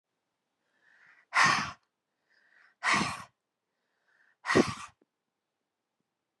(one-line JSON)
{"exhalation_length": "6.4 s", "exhalation_amplitude": 10884, "exhalation_signal_mean_std_ratio": 0.29, "survey_phase": "beta (2021-08-13 to 2022-03-07)", "age": "45-64", "gender": "Female", "wearing_mask": "No", "symptom_cough_any": true, "symptom_runny_or_blocked_nose": true, "symptom_fatigue": true, "symptom_headache": true, "symptom_change_to_sense_of_smell_or_taste": true, "symptom_onset": "10 days", "smoker_status": "Never smoked", "respiratory_condition_asthma": false, "respiratory_condition_other": false, "recruitment_source": "REACT", "submission_delay": "1 day", "covid_test_result": "Positive", "covid_test_method": "RT-qPCR", "covid_ct_value": 27.0, "covid_ct_gene": "E gene", "influenza_a_test_result": "Negative", "influenza_b_test_result": "Negative"}